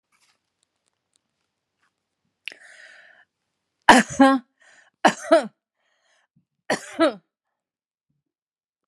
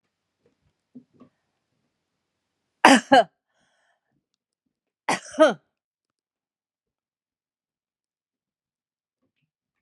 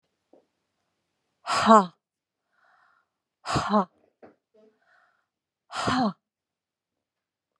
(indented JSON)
{
  "three_cough_length": "8.9 s",
  "three_cough_amplitude": 32768,
  "three_cough_signal_mean_std_ratio": 0.23,
  "cough_length": "9.8 s",
  "cough_amplitude": 32187,
  "cough_signal_mean_std_ratio": 0.17,
  "exhalation_length": "7.6 s",
  "exhalation_amplitude": 24705,
  "exhalation_signal_mean_std_ratio": 0.25,
  "survey_phase": "alpha (2021-03-01 to 2021-08-12)",
  "age": "65+",
  "gender": "Female",
  "wearing_mask": "No",
  "symptom_none": true,
  "smoker_status": "Never smoked",
  "respiratory_condition_asthma": false,
  "respiratory_condition_other": false,
  "recruitment_source": "REACT",
  "submission_delay": "1 day",
  "covid_test_result": "Negative",
  "covid_test_method": "RT-qPCR"
}